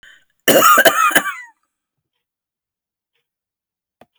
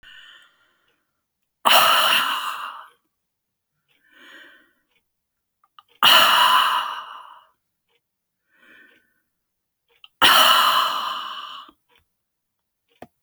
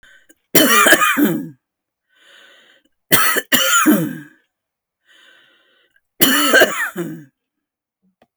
{"cough_length": "4.2 s", "cough_amplitude": 32768, "cough_signal_mean_std_ratio": 0.34, "exhalation_length": "13.2 s", "exhalation_amplitude": 31707, "exhalation_signal_mean_std_ratio": 0.38, "three_cough_length": "8.4 s", "three_cough_amplitude": 32768, "three_cough_signal_mean_std_ratio": 0.45, "survey_phase": "beta (2021-08-13 to 2022-03-07)", "age": "65+", "gender": "Female", "wearing_mask": "No", "symptom_cough_any": true, "symptom_headache": true, "symptom_onset": "12 days", "smoker_status": "Ex-smoker", "respiratory_condition_asthma": false, "respiratory_condition_other": false, "recruitment_source": "REACT", "submission_delay": "1 day", "covid_test_result": "Negative", "covid_test_method": "RT-qPCR"}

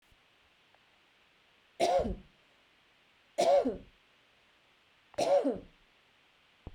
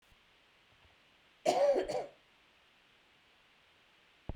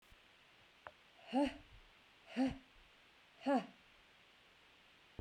{"three_cough_length": "6.7 s", "three_cough_amplitude": 4777, "three_cough_signal_mean_std_ratio": 0.35, "cough_length": "4.4 s", "cough_amplitude": 5511, "cough_signal_mean_std_ratio": 0.32, "exhalation_length": "5.2 s", "exhalation_amplitude": 1825, "exhalation_signal_mean_std_ratio": 0.35, "survey_phase": "beta (2021-08-13 to 2022-03-07)", "age": "45-64", "gender": "Female", "wearing_mask": "No", "symptom_cough_any": true, "symptom_change_to_sense_of_smell_or_taste": true, "smoker_status": "Never smoked", "respiratory_condition_asthma": false, "respiratory_condition_other": false, "recruitment_source": "REACT", "submission_delay": "2 days", "covid_test_result": "Negative", "covid_test_method": "RT-qPCR", "influenza_a_test_result": "Unknown/Void", "influenza_b_test_result": "Unknown/Void"}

